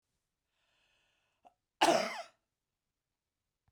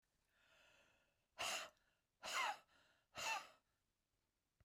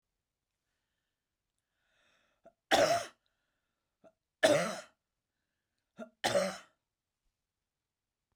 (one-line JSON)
{"cough_length": "3.7 s", "cough_amplitude": 6138, "cough_signal_mean_std_ratio": 0.23, "exhalation_length": "4.6 s", "exhalation_amplitude": 1076, "exhalation_signal_mean_std_ratio": 0.37, "three_cough_length": "8.4 s", "three_cough_amplitude": 9000, "three_cough_signal_mean_std_ratio": 0.26, "survey_phase": "beta (2021-08-13 to 2022-03-07)", "age": "65+", "gender": "Female", "wearing_mask": "No", "symptom_none": true, "smoker_status": "Ex-smoker", "respiratory_condition_asthma": false, "respiratory_condition_other": false, "recruitment_source": "REACT", "submission_delay": "3 days", "covid_test_result": "Negative", "covid_test_method": "RT-qPCR", "influenza_a_test_result": "Negative", "influenza_b_test_result": "Negative"}